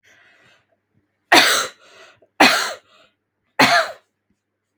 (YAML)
three_cough_length: 4.8 s
three_cough_amplitude: 32768
three_cough_signal_mean_std_ratio: 0.34
survey_phase: beta (2021-08-13 to 2022-03-07)
age: 18-44
gender: Female
wearing_mask: 'No'
symptom_none: true
smoker_status: Never smoked
respiratory_condition_asthma: false
respiratory_condition_other: false
recruitment_source: REACT
submission_delay: 2 days
covid_test_result: Negative
covid_test_method: RT-qPCR
influenza_a_test_result: Negative
influenza_b_test_result: Negative